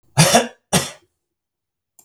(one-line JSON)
{"cough_length": "2.0 s", "cough_amplitude": 32768, "cough_signal_mean_std_ratio": 0.35, "survey_phase": "beta (2021-08-13 to 2022-03-07)", "age": "65+", "gender": "Male", "wearing_mask": "No", "symptom_runny_or_blocked_nose": true, "smoker_status": "Never smoked", "respiratory_condition_asthma": false, "respiratory_condition_other": false, "recruitment_source": "Test and Trace", "submission_delay": "0 days", "covid_test_result": "Negative", "covid_test_method": "LFT"}